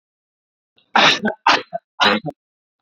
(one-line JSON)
{"three_cough_length": "2.8 s", "three_cough_amplitude": 30070, "three_cough_signal_mean_std_ratio": 0.4, "survey_phase": "beta (2021-08-13 to 2022-03-07)", "age": "18-44", "gender": "Male", "wearing_mask": "No", "symptom_none": true, "smoker_status": "Never smoked", "respiratory_condition_asthma": false, "respiratory_condition_other": false, "recruitment_source": "REACT", "submission_delay": "1 day", "covid_test_result": "Negative", "covid_test_method": "RT-qPCR", "influenza_a_test_result": "Negative", "influenza_b_test_result": "Negative"}